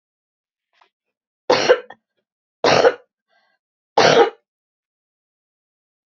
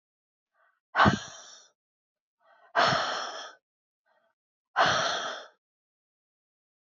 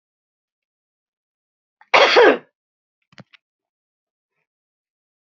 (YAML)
three_cough_length: 6.1 s
three_cough_amplitude: 30770
three_cough_signal_mean_std_ratio: 0.29
exhalation_length: 6.8 s
exhalation_amplitude: 14388
exhalation_signal_mean_std_ratio: 0.34
cough_length: 5.3 s
cough_amplitude: 29538
cough_signal_mean_std_ratio: 0.22
survey_phase: beta (2021-08-13 to 2022-03-07)
age: 45-64
gender: Female
wearing_mask: 'No'
symptom_cough_any: true
symptom_runny_or_blocked_nose: true
symptom_fatigue: true
symptom_change_to_sense_of_smell_or_taste: true
smoker_status: Never smoked
respiratory_condition_asthma: false
respiratory_condition_other: false
recruitment_source: REACT
submission_delay: 1 day
covid_test_result: Negative
covid_test_method: RT-qPCR
influenza_a_test_result: Unknown/Void
influenza_b_test_result: Unknown/Void